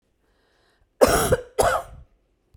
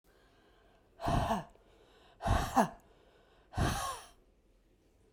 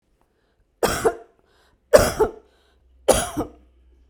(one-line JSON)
{"cough_length": "2.6 s", "cough_amplitude": 32767, "cough_signal_mean_std_ratio": 0.38, "exhalation_length": "5.1 s", "exhalation_amplitude": 7189, "exhalation_signal_mean_std_ratio": 0.41, "three_cough_length": "4.1 s", "three_cough_amplitude": 32768, "three_cough_signal_mean_std_ratio": 0.32, "survey_phase": "beta (2021-08-13 to 2022-03-07)", "age": "45-64", "gender": "Female", "wearing_mask": "No", "symptom_none": true, "smoker_status": "Ex-smoker", "respiratory_condition_asthma": false, "respiratory_condition_other": false, "recruitment_source": "REACT", "submission_delay": "2 days", "covid_test_result": "Negative", "covid_test_method": "RT-qPCR"}